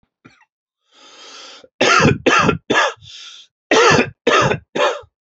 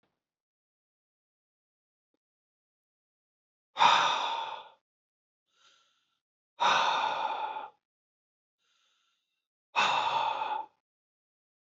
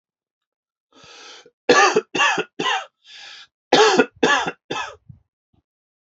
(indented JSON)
{
  "cough_length": "5.4 s",
  "cough_amplitude": 31380,
  "cough_signal_mean_std_ratio": 0.5,
  "exhalation_length": "11.7 s",
  "exhalation_amplitude": 10923,
  "exhalation_signal_mean_std_ratio": 0.36,
  "three_cough_length": "6.1 s",
  "three_cough_amplitude": 32767,
  "three_cough_signal_mean_std_ratio": 0.4,
  "survey_phase": "alpha (2021-03-01 to 2021-08-12)",
  "age": "45-64",
  "gender": "Male",
  "wearing_mask": "No",
  "symptom_abdominal_pain": true,
  "symptom_diarrhoea": true,
  "symptom_fatigue": true,
  "symptom_fever_high_temperature": true,
  "symptom_headache": true,
  "smoker_status": "Never smoked",
  "respiratory_condition_asthma": false,
  "respiratory_condition_other": false,
  "recruitment_source": "REACT",
  "submission_delay": "5 days",
  "covid_test_result": "Negative",
  "covid_test_method": "RT-qPCR"
}